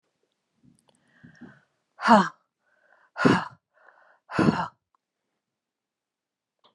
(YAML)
exhalation_length: 6.7 s
exhalation_amplitude: 27319
exhalation_signal_mean_std_ratio: 0.25
survey_phase: beta (2021-08-13 to 2022-03-07)
age: 65+
gender: Female
wearing_mask: 'No'
symptom_none: true
smoker_status: Ex-smoker
respiratory_condition_asthma: false
respiratory_condition_other: false
recruitment_source: REACT
submission_delay: 2 days
covid_test_result: Negative
covid_test_method: RT-qPCR